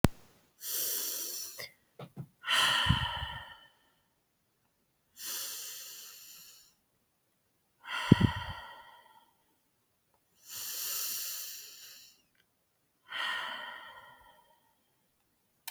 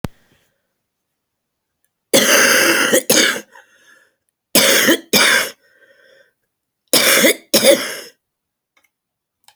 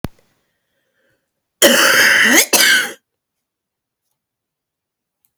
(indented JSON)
{
  "exhalation_length": "15.7 s",
  "exhalation_amplitude": 22311,
  "exhalation_signal_mean_std_ratio": 0.37,
  "three_cough_length": "9.6 s",
  "three_cough_amplitude": 32768,
  "three_cough_signal_mean_std_ratio": 0.45,
  "cough_length": "5.4 s",
  "cough_amplitude": 32768,
  "cough_signal_mean_std_ratio": 0.4,
  "survey_phase": "beta (2021-08-13 to 2022-03-07)",
  "age": "45-64",
  "gender": "Female",
  "wearing_mask": "No",
  "symptom_cough_any": true,
  "symptom_new_continuous_cough": true,
  "symptom_runny_or_blocked_nose": true,
  "symptom_shortness_of_breath": true,
  "symptom_sore_throat": true,
  "symptom_abdominal_pain": true,
  "symptom_fatigue": true,
  "symptom_headache": true,
  "symptom_onset": "12 days",
  "smoker_status": "Prefer not to say",
  "respiratory_condition_asthma": false,
  "respiratory_condition_other": false,
  "recruitment_source": "REACT",
  "submission_delay": "1 day",
  "covid_test_result": "Negative",
  "covid_test_method": "RT-qPCR",
  "influenza_a_test_result": "Negative",
  "influenza_b_test_result": "Negative"
}